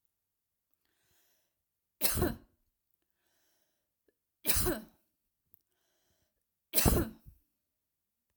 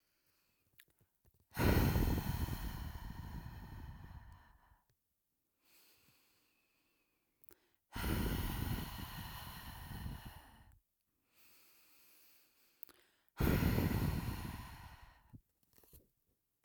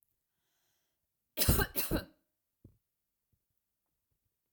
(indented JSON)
{
  "three_cough_length": "8.4 s",
  "three_cough_amplitude": 10583,
  "three_cough_signal_mean_std_ratio": 0.26,
  "exhalation_length": "16.6 s",
  "exhalation_amplitude": 3886,
  "exhalation_signal_mean_std_ratio": 0.43,
  "cough_length": "4.5 s",
  "cough_amplitude": 6326,
  "cough_signal_mean_std_ratio": 0.26,
  "survey_phase": "beta (2021-08-13 to 2022-03-07)",
  "age": "18-44",
  "gender": "Female",
  "wearing_mask": "No",
  "symptom_none": true,
  "smoker_status": "Never smoked",
  "respiratory_condition_asthma": false,
  "respiratory_condition_other": false,
  "recruitment_source": "REACT",
  "submission_delay": "2 days",
  "covid_test_result": "Negative",
  "covid_test_method": "RT-qPCR"
}